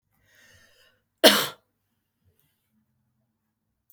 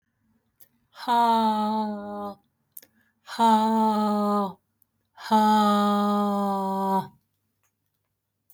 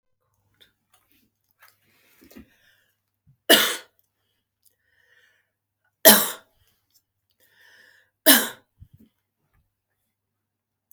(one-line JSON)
{"cough_length": "3.9 s", "cough_amplitude": 29777, "cough_signal_mean_std_ratio": 0.17, "exhalation_length": "8.5 s", "exhalation_amplitude": 12195, "exhalation_signal_mean_std_ratio": 0.62, "three_cough_length": "10.9 s", "three_cough_amplitude": 32768, "three_cough_signal_mean_std_ratio": 0.18, "survey_phase": "beta (2021-08-13 to 2022-03-07)", "age": "45-64", "gender": "Female", "wearing_mask": "No", "symptom_runny_or_blocked_nose": true, "smoker_status": "Prefer not to say", "respiratory_condition_asthma": false, "respiratory_condition_other": false, "recruitment_source": "REACT", "submission_delay": "4 days", "covid_test_result": "Negative", "covid_test_method": "RT-qPCR"}